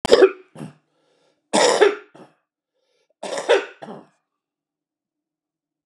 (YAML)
three_cough_length: 5.9 s
three_cough_amplitude: 32768
three_cough_signal_mean_std_ratio: 0.3
survey_phase: beta (2021-08-13 to 2022-03-07)
age: 65+
gender: Male
wearing_mask: 'No'
symptom_runny_or_blocked_nose: true
symptom_sore_throat: true
symptom_onset: 7 days
smoker_status: Never smoked
respiratory_condition_asthma: false
respiratory_condition_other: false
recruitment_source: REACT
submission_delay: 1 day
covid_test_result: Negative
covid_test_method: RT-qPCR
influenza_a_test_result: Negative
influenza_b_test_result: Negative